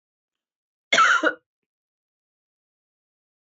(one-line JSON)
{"cough_length": "3.4 s", "cough_amplitude": 17536, "cough_signal_mean_std_ratio": 0.27, "survey_phase": "alpha (2021-03-01 to 2021-08-12)", "age": "18-44", "gender": "Female", "wearing_mask": "No", "symptom_cough_any": true, "symptom_shortness_of_breath": true, "symptom_fatigue": true, "symptom_headache": true, "symptom_change_to_sense_of_smell_or_taste": true, "symptom_loss_of_taste": true, "symptom_onset": "5 days", "smoker_status": "Ex-smoker", "respiratory_condition_asthma": false, "respiratory_condition_other": false, "recruitment_source": "Test and Trace", "submission_delay": "2 days", "covid_test_result": "Positive", "covid_test_method": "RT-qPCR", "covid_ct_value": 21.3, "covid_ct_gene": "E gene"}